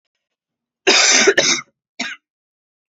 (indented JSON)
{
  "cough_length": "2.9 s",
  "cough_amplitude": 31004,
  "cough_signal_mean_std_ratio": 0.42,
  "survey_phase": "beta (2021-08-13 to 2022-03-07)",
  "age": "18-44",
  "gender": "Female",
  "wearing_mask": "No",
  "symptom_cough_any": true,
  "symptom_runny_or_blocked_nose": true,
  "symptom_sore_throat": true,
  "symptom_fatigue": true,
  "symptom_change_to_sense_of_smell_or_taste": true,
  "symptom_onset": "7 days",
  "smoker_status": "Never smoked",
  "respiratory_condition_asthma": true,
  "respiratory_condition_other": false,
  "recruitment_source": "Test and Trace",
  "submission_delay": "3 days",
  "covid_test_result": "Positive",
  "covid_test_method": "RT-qPCR"
}